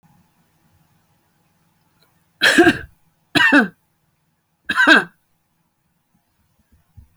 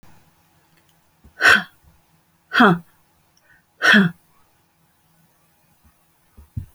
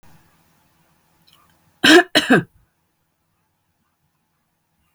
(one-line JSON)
{"three_cough_length": "7.2 s", "three_cough_amplitude": 29969, "three_cough_signal_mean_std_ratio": 0.29, "exhalation_length": "6.7 s", "exhalation_amplitude": 31826, "exhalation_signal_mean_std_ratio": 0.27, "cough_length": "4.9 s", "cough_amplitude": 30635, "cough_signal_mean_std_ratio": 0.23, "survey_phase": "alpha (2021-03-01 to 2021-08-12)", "age": "45-64", "gender": "Female", "wearing_mask": "No", "symptom_none": true, "smoker_status": "Ex-smoker", "respiratory_condition_asthma": true, "respiratory_condition_other": false, "recruitment_source": "REACT", "submission_delay": "33 days", "covid_test_result": "Negative", "covid_test_method": "RT-qPCR"}